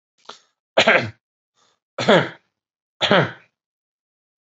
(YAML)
three_cough_length: 4.4 s
three_cough_amplitude: 28161
three_cough_signal_mean_std_ratio: 0.31
survey_phase: beta (2021-08-13 to 2022-03-07)
age: 45-64
gender: Male
wearing_mask: 'No'
symptom_none: true
smoker_status: Current smoker (1 to 10 cigarettes per day)
respiratory_condition_asthma: false
respiratory_condition_other: false
recruitment_source: REACT
submission_delay: 1 day
covid_test_result: Negative
covid_test_method: RT-qPCR